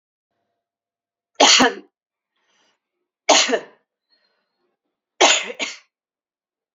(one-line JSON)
{"three_cough_length": "6.7 s", "three_cough_amplitude": 32135, "three_cough_signal_mean_std_ratio": 0.29, "survey_phase": "beta (2021-08-13 to 2022-03-07)", "age": "45-64", "gender": "Female", "wearing_mask": "No", "symptom_cough_any": true, "symptom_runny_or_blocked_nose": true, "symptom_shortness_of_breath": true, "symptom_sore_throat": true, "symptom_headache": true, "smoker_status": "Never smoked", "respiratory_condition_asthma": false, "respiratory_condition_other": false, "recruitment_source": "Test and Trace", "submission_delay": "2 days", "covid_test_result": "Positive", "covid_test_method": "LAMP"}